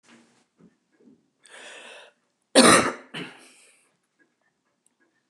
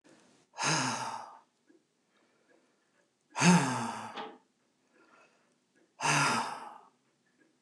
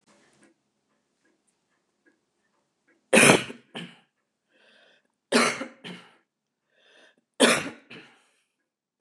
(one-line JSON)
{"cough_length": "5.3 s", "cough_amplitude": 28612, "cough_signal_mean_std_ratio": 0.22, "exhalation_length": "7.6 s", "exhalation_amplitude": 10075, "exhalation_signal_mean_std_ratio": 0.38, "three_cough_length": "9.0 s", "three_cough_amplitude": 26137, "three_cough_signal_mean_std_ratio": 0.24, "survey_phase": "beta (2021-08-13 to 2022-03-07)", "age": "65+", "gender": "Female", "wearing_mask": "No", "symptom_runny_or_blocked_nose": true, "smoker_status": "Never smoked", "respiratory_condition_asthma": false, "respiratory_condition_other": false, "recruitment_source": "REACT", "submission_delay": "3 days", "covid_test_result": "Negative", "covid_test_method": "RT-qPCR", "influenza_a_test_result": "Negative", "influenza_b_test_result": "Negative"}